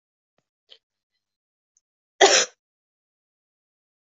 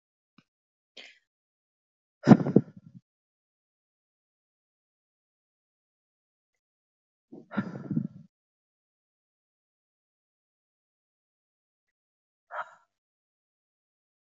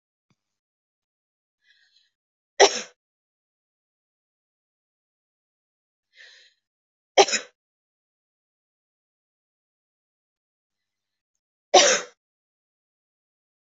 cough_length: 4.2 s
cough_amplitude: 24274
cough_signal_mean_std_ratio: 0.18
exhalation_length: 14.3 s
exhalation_amplitude: 23316
exhalation_signal_mean_std_ratio: 0.12
three_cough_length: 13.7 s
three_cough_amplitude: 26634
three_cough_signal_mean_std_ratio: 0.15
survey_phase: beta (2021-08-13 to 2022-03-07)
age: 45-64
gender: Female
wearing_mask: 'No'
symptom_headache: true
smoker_status: Never smoked
respiratory_condition_asthma: false
respiratory_condition_other: false
recruitment_source: REACT
submission_delay: 4 days
covid_test_result: Negative
covid_test_method: RT-qPCR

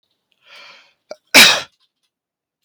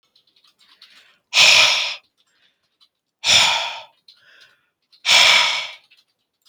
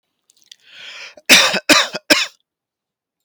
cough_length: 2.6 s
cough_amplitude: 32768
cough_signal_mean_std_ratio: 0.26
exhalation_length: 6.5 s
exhalation_amplitude: 32768
exhalation_signal_mean_std_ratio: 0.4
three_cough_length: 3.2 s
three_cough_amplitude: 32768
three_cough_signal_mean_std_ratio: 0.35
survey_phase: beta (2021-08-13 to 2022-03-07)
age: 18-44
gender: Male
wearing_mask: 'No'
symptom_none: true
smoker_status: Never smoked
respiratory_condition_asthma: false
respiratory_condition_other: false
recruitment_source: REACT
submission_delay: 1 day
covid_test_result: Negative
covid_test_method: RT-qPCR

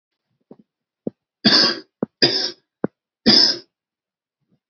three_cough_length: 4.7 s
three_cough_amplitude: 30782
three_cough_signal_mean_std_ratio: 0.34
survey_phase: beta (2021-08-13 to 2022-03-07)
age: 18-44
gender: Male
wearing_mask: 'No'
symptom_none: true
smoker_status: Never smoked
respiratory_condition_asthma: false
respiratory_condition_other: false
recruitment_source: REACT
submission_delay: 2 days
covid_test_result: Negative
covid_test_method: RT-qPCR
influenza_a_test_result: Negative
influenza_b_test_result: Negative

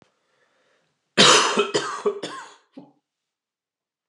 cough_length: 4.1 s
cough_amplitude: 28606
cough_signal_mean_std_ratio: 0.34
survey_phase: alpha (2021-03-01 to 2021-08-12)
age: 45-64
gender: Male
wearing_mask: 'No'
symptom_none: true
smoker_status: Ex-smoker
respiratory_condition_asthma: false
respiratory_condition_other: false
recruitment_source: REACT
submission_delay: 32 days
covid_test_result: Negative
covid_test_method: RT-qPCR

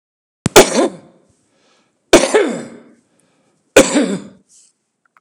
three_cough_length: 5.2 s
three_cough_amplitude: 32768
three_cough_signal_mean_std_ratio: 0.34
survey_phase: beta (2021-08-13 to 2022-03-07)
age: 65+
gender: Male
wearing_mask: 'No'
symptom_none: true
smoker_status: Never smoked
respiratory_condition_asthma: false
respiratory_condition_other: false
recruitment_source: REACT
submission_delay: 7 days
covid_test_result: Negative
covid_test_method: RT-qPCR
influenza_a_test_result: Negative
influenza_b_test_result: Negative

